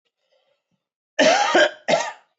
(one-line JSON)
{"cough_length": "2.4 s", "cough_amplitude": 18771, "cough_signal_mean_std_ratio": 0.45, "survey_phase": "beta (2021-08-13 to 2022-03-07)", "age": "18-44", "gender": "Male", "wearing_mask": "No", "symptom_cough_any": true, "symptom_diarrhoea": true, "symptom_fatigue": true, "symptom_headache": true, "smoker_status": "Never smoked", "respiratory_condition_asthma": false, "respiratory_condition_other": false, "recruitment_source": "Test and Trace", "submission_delay": "2 days", "covid_test_result": "Positive", "covid_test_method": "ePCR"}